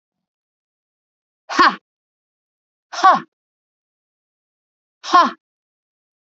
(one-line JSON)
{"exhalation_length": "6.2 s", "exhalation_amplitude": 32768, "exhalation_signal_mean_std_ratio": 0.24, "survey_phase": "beta (2021-08-13 to 2022-03-07)", "age": "45-64", "gender": "Female", "wearing_mask": "No", "symptom_cough_any": true, "symptom_runny_or_blocked_nose": true, "symptom_fatigue": true, "symptom_headache": true, "symptom_change_to_sense_of_smell_or_taste": true, "symptom_onset": "3 days", "smoker_status": "Never smoked", "respiratory_condition_asthma": false, "respiratory_condition_other": false, "recruitment_source": "Test and Trace", "submission_delay": "2 days", "covid_test_result": "Positive", "covid_test_method": "RT-qPCR", "covid_ct_value": 17.1, "covid_ct_gene": "ORF1ab gene", "covid_ct_mean": 17.5, "covid_viral_load": "1800000 copies/ml", "covid_viral_load_category": "High viral load (>1M copies/ml)"}